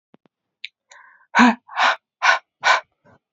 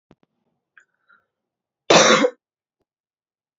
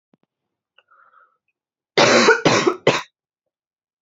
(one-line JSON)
{"exhalation_length": "3.3 s", "exhalation_amplitude": 27732, "exhalation_signal_mean_std_ratio": 0.36, "cough_length": "3.6 s", "cough_amplitude": 29499, "cough_signal_mean_std_ratio": 0.26, "three_cough_length": "4.0 s", "three_cough_amplitude": 30810, "three_cough_signal_mean_std_ratio": 0.36, "survey_phase": "beta (2021-08-13 to 2022-03-07)", "age": "18-44", "gender": "Female", "wearing_mask": "No", "symptom_cough_any": true, "symptom_runny_or_blocked_nose": true, "symptom_sore_throat": true, "symptom_fatigue": true, "symptom_headache": true, "symptom_change_to_sense_of_smell_or_taste": true, "smoker_status": "Never smoked", "respiratory_condition_asthma": true, "respiratory_condition_other": false, "recruitment_source": "Test and Trace", "submission_delay": "1 day", "covid_test_result": "Positive", "covid_test_method": "RT-qPCR", "covid_ct_value": 16.1, "covid_ct_gene": "ORF1ab gene", "covid_ct_mean": 16.7, "covid_viral_load": "3300000 copies/ml", "covid_viral_load_category": "High viral load (>1M copies/ml)"}